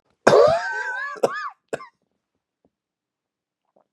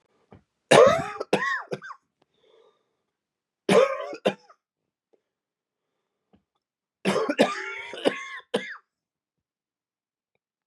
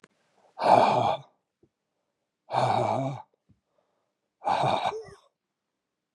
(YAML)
cough_length: 3.9 s
cough_amplitude: 32768
cough_signal_mean_std_ratio: 0.35
three_cough_length: 10.7 s
three_cough_amplitude: 27170
three_cough_signal_mean_std_ratio: 0.3
exhalation_length: 6.1 s
exhalation_amplitude: 18850
exhalation_signal_mean_std_ratio: 0.42
survey_phase: beta (2021-08-13 to 2022-03-07)
age: 45-64
gender: Male
wearing_mask: 'No'
symptom_cough_any: true
symptom_shortness_of_breath: true
symptom_sore_throat: true
symptom_fatigue: true
symptom_headache: true
symptom_change_to_sense_of_smell_or_taste: true
symptom_onset: 4 days
smoker_status: Never smoked
respiratory_condition_asthma: false
respiratory_condition_other: false
recruitment_source: Test and Trace
submission_delay: 2 days
covid_test_result: Positive
covid_test_method: RT-qPCR
covid_ct_value: 23.9
covid_ct_gene: N gene